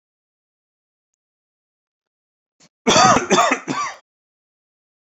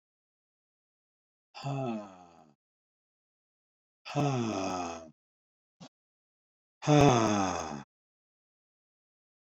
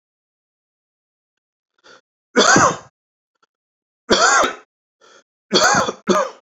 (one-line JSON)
{"cough_length": "5.1 s", "cough_amplitude": 29056, "cough_signal_mean_std_ratio": 0.31, "exhalation_length": "9.5 s", "exhalation_amplitude": 10559, "exhalation_signal_mean_std_ratio": 0.33, "three_cough_length": "6.6 s", "three_cough_amplitude": 29637, "three_cough_signal_mean_std_ratio": 0.37, "survey_phase": "beta (2021-08-13 to 2022-03-07)", "age": "65+", "gender": "Male", "wearing_mask": "No", "symptom_none": true, "smoker_status": "Never smoked", "respiratory_condition_asthma": false, "respiratory_condition_other": false, "recruitment_source": "REACT", "submission_delay": "1 day", "covid_test_result": "Negative", "covid_test_method": "RT-qPCR"}